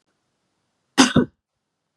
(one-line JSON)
{"cough_length": "2.0 s", "cough_amplitude": 32224, "cough_signal_mean_std_ratio": 0.25, "survey_phase": "beta (2021-08-13 to 2022-03-07)", "age": "18-44", "gender": "Female", "wearing_mask": "No", "symptom_none": true, "smoker_status": "Never smoked", "respiratory_condition_asthma": false, "respiratory_condition_other": false, "recruitment_source": "REACT", "submission_delay": "1 day", "covid_test_result": "Negative", "covid_test_method": "RT-qPCR", "influenza_a_test_result": "Negative", "influenza_b_test_result": "Negative"}